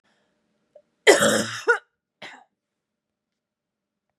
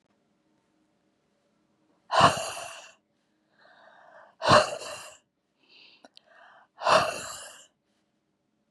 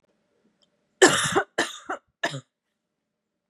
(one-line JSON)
{"cough_length": "4.2 s", "cough_amplitude": 31741, "cough_signal_mean_std_ratio": 0.27, "exhalation_length": "8.7 s", "exhalation_amplitude": 19316, "exhalation_signal_mean_std_ratio": 0.27, "three_cough_length": "3.5 s", "three_cough_amplitude": 29847, "three_cough_signal_mean_std_ratio": 0.3, "survey_phase": "beta (2021-08-13 to 2022-03-07)", "age": "18-44", "gender": "Female", "wearing_mask": "No", "symptom_cough_any": true, "symptom_runny_or_blocked_nose": true, "symptom_sore_throat": true, "symptom_diarrhoea": true, "symptom_other": true, "smoker_status": "Never smoked", "respiratory_condition_asthma": false, "respiratory_condition_other": false, "recruitment_source": "Test and Trace", "submission_delay": "1 day", "covid_test_result": "Positive", "covid_test_method": "LFT"}